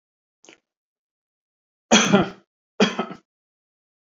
cough_length: 4.0 s
cough_amplitude: 27334
cough_signal_mean_std_ratio: 0.27
survey_phase: beta (2021-08-13 to 2022-03-07)
age: 45-64
gender: Male
wearing_mask: 'No'
symptom_none: true
smoker_status: Never smoked
respiratory_condition_asthma: false
respiratory_condition_other: false
recruitment_source: REACT
submission_delay: 2 days
covid_test_result: Negative
covid_test_method: RT-qPCR
influenza_a_test_result: Negative
influenza_b_test_result: Negative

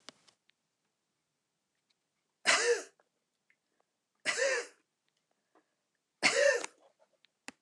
three_cough_length: 7.6 s
three_cough_amplitude: 9307
three_cough_signal_mean_std_ratio: 0.3
survey_phase: beta (2021-08-13 to 2022-03-07)
age: 65+
gender: Female
wearing_mask: 'No'
symptom_none: true
smoker_status: Never smoked
respiratory_condition_asthma: false
respiratory_condition_other: false
recruitment_source: REACT
submission_delay: 2 days
covid_test_result: Negative
covid_test_method: RT-qPCR
influenza_a_test_result: Negative
influenza_b_test_result: Negative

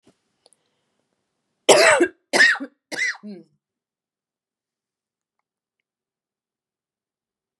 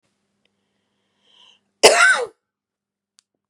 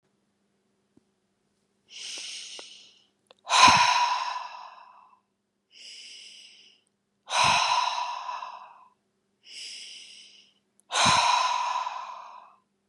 three_cough_length: 7.6 s
three_cough_amplitude: 32768
three_cough_signal_mean_std_ratio: 0.25
cough_length: 3.5 s
cough_amplitude: 32768
cough_signal_mean_std_ratio: 0.26
exhalation_length: 12.9 s
exhalation_amplitude: 23102
exhalation_signal_mean_std_ratio: 0.41
survey_phase: beta (2021-08-13 to 2022-03-07)
age: 45-64
gender: Female
wearing_mask: 'No'
symptom_none: true
smoker_status: Never smoked
respiratory_condition_asthma: true
respiratory_condition_other: false
recruitment_source: REACT
submission_delay: 2 days
covid_test_result: Negative
covid_test_method: RT-qPCR
influenza_a_test_result: Negative
influenza_b_test_result: Negative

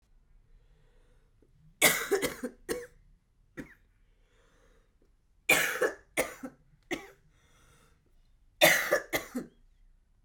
three_cough_length: 10.2 s
three_cough_amplitude: 13966
three_cough_signal_mean_std_ratio: 0.32
survey_phase: beta (2021-08-13 to 2022-03-07)
age: 65+
gender: Female
wearing_mask: 'Yes'
symptom_cough_any: true
symptom_new_continuous_cough: true
symptom_runny_or_blocked_nose: true
symptom_shortness_of_breath: true
symptom_sore_throat: true
symptom_fatigue: true
symptom_fever_high_temperature: true
symptom_headache: true
symptom_change_to_sense_of_smell_or_taste: true
symptom_onset: 3 days
smoker_status: Current smoker (1 to 10 cigarettes per day)
respiratory_condition_asthma: false
respiratory_condition_other: false
recruitment_source: Test and Trace
submission_delay: 2 days
covid_test_result: Positive
covid_test_method: ePCR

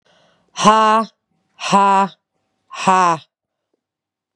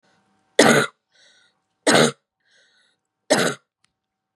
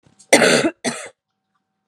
exhalation_length: 4.4 s
exhalation_amplitude: 32767
exhalation_signal_mean_std_ratio: 0.43
three_cough_length: 4.4 s
three_cough_amplitude: 32733
three_cough_signal_mean_std_ratio: 0.32
cough_length: 1.9 s
cough_amplitude: 32768
cough_signal_mean_std_ratio: 0.39
survey_phase: beta (2021-08-13 to 2022-03-07)
age: 45-64
gender: Female
wearing_mask: 'No'
symptom_cough_any: true
symptom_runny_or_blocked_nose: true
symptom_fatigue: true
symptom_headache: true
smoker_status: Never smoked
respiratory_condition_asthma: false
respiratory_condition_other: false
recruitment_source: Test and Trace
submission_delay: 1 day
covid_test_result: Positive
covid_test_method: LFT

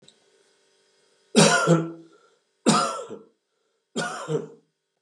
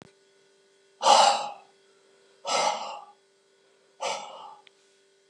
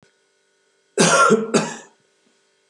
three_cough_length: 5.0 s
three_cough_amplitude: 27365
three_cough_signal_mean_std_ratio: 0.38
exhalation_length: 5.3 s
exhalation_amplitude: 18588
exhalation_signal_mean_std_ratio: 0.34
cough_length: 2.7 s
cough_amplitude: 26566
cough_signal_mean_std_ratio: 0.41
survey_phase: beta (2021-08-13 to 2022-03-07)
age: 65+
gender: Male
wearing_mask: 'No'
symptom_none: true
symptom_onset: 12 days
smoker_status: Never smoked
respiratory_condition_asthma: false
respiratory_condition_other: false
recruitment_source: REACT
submission_delay: 3 days
covid_test_result: Negative
covid_test_method: RT-qPCR
influenza_a_test_result: Negative
influenza_b_test_result: Negative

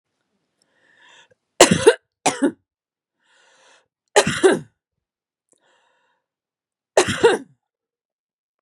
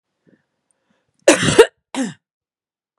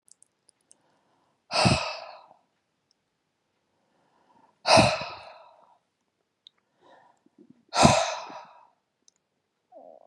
three_cough_length: 8.6 s
three_cough_amplitude: 32768
three_cough_signal_mean_std_ratio: 0.26
cough_length: 3.0 s
cough_amplitude: 32768
cough_signal_mean_std_ratio: 0.27
exhalation_length: 10.1 s
exhalation_amplitude: 26179
exhalation_signal_mean_std_ratio: 0.26
survey_phase: beta (2021-08-13 to 2022-03-07)
age: 45-64
gender: Female
wearing_mask: 'No'
symptom_none: true
smoker_status: Current smoker (e-cigarettes or vapes only)
respiratory_condition_asthma: true
respiratory_condition_other: false
recruitment_source: REACT
submission_delay: 2 days
covid_test_result: Negative
covid_test_method: RT-qPCR
influenza_a_test_result: Negative
influenza_b_test_result: Negative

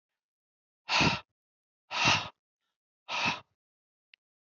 exhalation_length: 4.5 s
exhalation_amplitude: 8065
exhalation_signal_mean_std_ratio: 0.34
survey_phase: beta (2021-08-13 to 2022-03-07)
age: 45-64
gender: Male
wearing_mask: 'No'
symptom_cough_any: true
symptom_runny_or_blocked_nose: true
symptom_fatigue: true
symptom_onset: 3 days
smoker_status: Never smoked
respiratory_condition_asthma: false
respiratory_condition_other: false
recruitment_source: Test and Trace
submission_delay: 2 days
covid_test_result: Positive
covid_test_method: RT-qPCR
covid_ct_value: 17.9
covid_ct_gene: ORF1ab gene
covid_ct_mean: 18.5
covid_viral_load: 850000 copies/ml
covid_viral_load_category: Low viral load (10K-1M copies/ml)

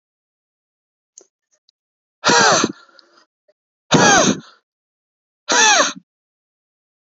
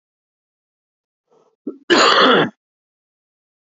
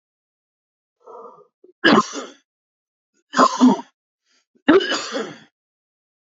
exhalation_length: 7.1 s
exhalation_amplitude: 29086
exhalation_signal_mean_std_ratio: 0.36
cough_length: 3.8 s
cough_amplitude: 29068
cough_signal_mean_std_ratio: 0.33
three_cough_length: 6.3 s
three_cough_amplitude: 30646
three_cough_signal_mean_std_ratio: 0.32
survey_phase: beta (2021-08-13 to 2022-03-07)
age: 18-44
gender: Male
wearing_mask: 'No'
symptom_change_to_sense_of_smell_or_taste: true
smoker_status: Ex-smoker
respiratory_condition_asthma: false
respiratory_condition_other: false
recruitment_source: Test and Trace
submission_delay: 1 day
covid_test_result: Positive
covid_test_method: ePCR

